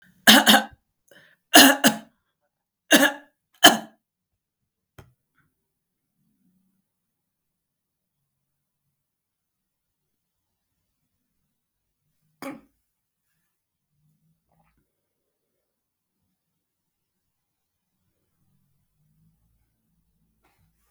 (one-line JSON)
{"three_cough_length": "20.9 s", "three_cough_amplitude": 32768, "three_cough_signal_mean_std_ratio": 0.16, "survey_phase": "beta (2021-08-13 to 2022-03-07)", "age": "45-64", "gender": "Female", "wearing_mask": "No", "symptom_none": true, "smoker_status": "Never smoked", "respiratory_condition_asthma": false, "respiratory_condition_other": false, "recruitment_source": "REACT", "submission_delay": "1 day", "covid_test_result": "Negative", "covid_test_method": "RT-qPCR", "influenza_a_test_result": "Negative", "influenza_b_test_result": "Negative"}